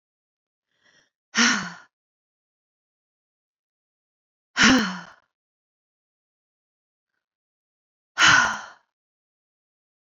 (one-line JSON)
{"exhalation_length": "10.1 s", "exhalation_amplitude": 24849, "exhalation_signal_mean_std_ratio": 0.25, "survey_phase": "beta (2021-08-13 to 2022-03-07)", "age": "18-44", "gender": "Female", "wearing_mask": "No", "symptom_none": true, "smoker_status": "Never smoked", "respiratory_condition_asthma": false, "respiratory_condition_other": false, "recruitment_source": "REACT", "submission_delay": "1 day", "covid_test_result": "Negative", "covid_test_method": "RT-qPCR"}